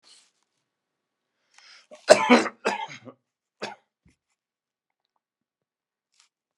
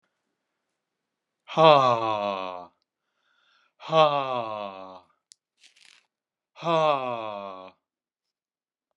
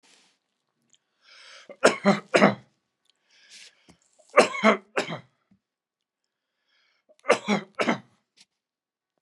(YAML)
cough_length: 6.6 s
cough_amplitude: 32767
cough_signal_mean_std_ratio: 0.19
exhalation_length: 9.0 s
exhalation_amplitude: 24041
exhalation_signal_mean_std_ratio: 0.34
three_cough_length: 9.2 s
three_cough_amplitude: 28326
three_cough_signal_mean_std_ratio: 0.26
survey_phase: beta (2021-08-13 to 2022-03-07)
age: 65+
gender: Male
wearing_mask: 'No'
symptom_cough_any: true
symptom_runny_or_blocked_nose: true
symptom_shortness_of_breath: true
symptom_sore_throat: true
symptom_onset: 4 days
smoker_status: Never smoked
respiratory_condition_asthma: true
respiratory_condition_other: false
recruitment_source: Test and Trace
submission_delay: 2 days
covid_test_result: Positive
covid_test_method: RT-qPCR
covid_ct_value: 34.6
covid_ct_gene: ORF1ab gene